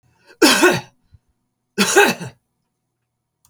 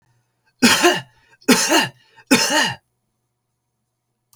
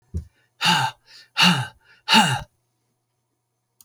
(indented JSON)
{
  "cough_length": "3.5 s",
  "cough_amplitude": 32767,
  "cough_signal_mean_std_ratio": 0.37,
  "three_cough_length": "4.4 s",
  "three_cough_amplitude": 32768,
  "three_cough_signal_mean_std_ratio": 0.41,
  "exhalation_length": "3.8 s",
  "exhalation_amplitude": 27037,
  "exhalation_signal_mean_std_ratio": 0.39,
  "survey_phase": "alpha (2021-03-01 to 2021-08-12)",
  "age": "65+",
  "gender": "Male",
  "wearing_mask": "No",
  "symptom_fatigue": true,
  "smoker_status": "Never smoked",
  "respiratory_condition_asthma": false,
  "respiratory_condition_other": false,
  "recruitment_source": "REACT",
  "submission_delay": "2 days",
  "covid_test_result": "Negative",
  "covid_test_method": "RT-qPCR"
}